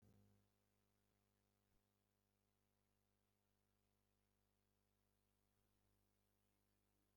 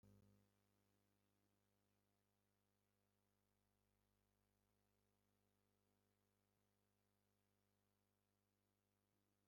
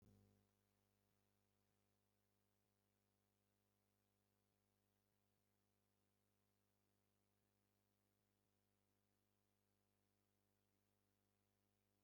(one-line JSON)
{"cough_length": "7.2 s", "cough_amplitude": 25, "cough_signal_mean_std_ratio": 0.69, "exhalation_length": "9.5 s", "exhalation_amplitude": 28, "exhalation_signal_mean_std_ratio": 0.58, "three_cough_length": "12.0 s", "three_cough_amplitude": 25, "three_cough_signal_mean_std_ratio": 0.64, "survey_phase": "alpha (2021-03-01 to 2021-08-12)", "age": "65+", "gender": "Male", "wearing_mask": "No", "symptom_none": true, "smoker_status": "Ex-smoker", "respiratory_condition_asthma": false, "respiratory_condition_other": false, "recruitment_source": "REACT", "submission_delay": "4 days", "covid_test_result": "Negative", "covid_test_method": "RT-qPCR"}